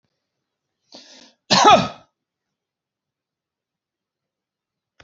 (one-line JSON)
{"cough_length": "5.0 s", "cough_amplitude": 29028, "cough_signal_mean_std_ratio": 0.21, "survey_phase": "beta (2021-08-13 to 2022-03-07)", "age": "45-64", "gender": "Male", "wearing_mask": "No", "symptom_none": true, "smoker_status": "Never smoked", "respiratory_condition_asthma": false, "respiratory_condition_other": false, "recruitment_source": "REACT", "submission_delay": "3 days", "covid_test_result": "Negative", "covid_test_method": "RT-qPCR", "influenza_a_test_result": "Unknown/Void", "influenza_b_test_result": "Unknown/Void"}